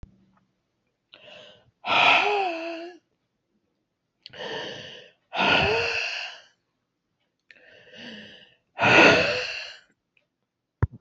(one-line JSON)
{"exhalation_length": "11.0 s", "exhalation_amplitude": 22579, "exhalation_signal_mean_std_ratio": 0.39, "survey_phase": "beta (2021-08-13 to 2022-03-07)", "age": "45-64", "gender": "Female", "wearing_mask": "No", "symptom_cough_any": true, "symptom_new_continuous_cough": true, "symptom_runny_or_blocked_nose": true, "symptom_shortness_of_breath": true, "symptom_sore_throat": true, "symptom_abdominal_pain": true, "symptom_fatigue": true, "symptom_headache": true, "symptom_change_to_sense_of_smell_or_taste": true, "symptom_other": true, "smoker_status": "Never smoked", "respiratory_condition_asthma": false, "respiratory_condition_other": false, "recruitment_source": "Test and Trace", "submission_delay": "0 days", "covid_test_result": "Positive", "covid_test_method": "LFT"}